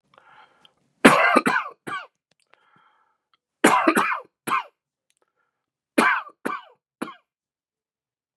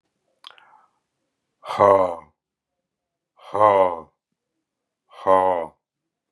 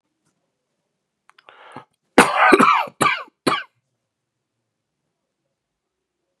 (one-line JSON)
{"three_cough_length": "8.4 s", "three_cough_amplitude": 32768, "three_cough_signal_mean_std_ratio": 0.32, "exhalation_length": "6.3 s", "exhalation_amplitude": 28356, "exhalation_signal_mean_std_ratio": 0.32, "cough_length": "6.4 s", "cough_amplitude": 32768, "cough_signal_mean_std_ratio": 0.29, "survey_phase": "beta (2021-08-13 to 2022-03-07)", "age": "45-64", "gender": "Male", "wearing_mask": "No", "symptom_cough_any": true, "symptom_sore_throat": true, "symptom_fatigue": true, "symptom_headache": true, "smoker_status": "Never smoked", "respiratory_condition_asthma": false, "respiratory_condition_other": false, "recruitment_source": "Test and Trace", "submission_delay": "1 day", "covid_test_result": "Positive", "covid_test_method": "RT-qPCR", "covid_ct_value": 26.9, "covid_ct_gene": "ORF1ab gene", "covid_ct_mean": 27.3, "covid_viral_load": "1100 copies/ml", "covid_viral_load_category": "Minimal viral load (< 10K copies/ml)"}